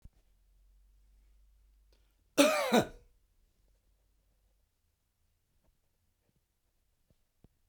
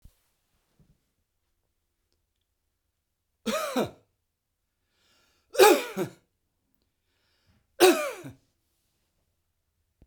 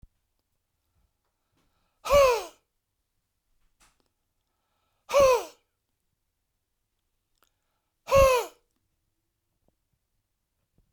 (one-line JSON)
{"cough_length": "7.7 s", "cough_amplitude": 10674, "cough_signal_mean_std_ratio": 0.2, "three_cough_length": "10.1 s", "three_cough_amplitude": 20181, "three_cough_signal_mean_std_ratio": 0.22, "exhalation_length": "10.9 s", "exhalation_amplitude": 12205, "exhalation_signal_mean_std_ratio": 0.25, "survey_phase": "beta (2021-08-13 to 2022-03-07)", "age": "65+", "gender": "Male", "wearing_mask": "No", "symptom_none": true, "smoker_status": "Never smoked", "respiratory_condition_asthma": false, "respiratory_condition_other": false, "recruitment_source": "REACT", "submission_delay": "2 days", "covid_test_result": "Negative", "covid_test_method": "RT-qPCR"}